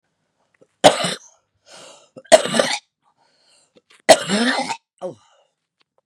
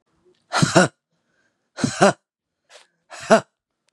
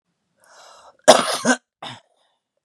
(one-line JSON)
{"three_cough_length": "6.1 s", "three_cough_amplitude": 32768, "three_cough_signal_mean_std_ratio": 0.29, "exhalation_length": "3.9 s", "exhalation_amplitude": 32763, "exhalation_signal_mean_std_ratio": 0.29, "cough_length": "2.6 s", "cough_amplitude": 32768, "cough_signal_mean_std_ratio": 0.27, "survey_phase": "beta (2021-08-13 to 2022-03-07)", "age": "45-64", "gender": "Female", "wearing_mask": "No", "symptom_shortness_of_breath": true, "symptom_fatigue": true, "symptom_headache": true, "symptom_onset": "12 days", "smoker_status": "Current smoker (11 or more cigarettes per day)", "respiratory_condition_asthma": false, "respiratory_condition_other": false, "recruitment_source": "REACT", "submission_delay": "1 day", "covid_test_result": "Negative", "covid_test_method": "RT-qPCR", "influenza_a_test_result": "Negative", "influenza_b_test_result": "Negative"}